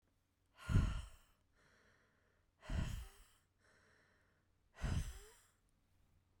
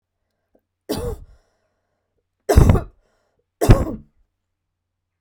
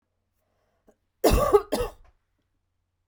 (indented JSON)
{
  "exhalation_length": "6.4 s",
  "exhalation_amplitude": 2820,
  "exhalation_signal_mean_std_ratio": 0.33,
  "three_cough_length": "5.2 s",
  "three_cough_amplitude": 32768,
  "three_cough_signal_mean_std_ratio": 0.27,
  "cough_length": "3.1 s",
  "cough_amplitude": 17062,
  "cough_signal_mean_std_ratio": 0.31,
  "survey_phase": "beta (2021-08-13 to 2022-03-07)",
  "age": "45-64",
  "gender": "Female",
  "wearing_mask": "No",
  "symptom_none": true,
  "smoker_status": "Never smoked",
  "respiratory_condition_asthma": true,
  "respiratory_condition_other": false,
  "recruitment_source": "REACT",
  "submission_delay": "1 day",
  "covid_test_result": "Negative",
  "covid_test_method": "RT-qPCR",
  "influenza_a_test_result": "Negative",
  "influenza_b_test_result": "Negative"
}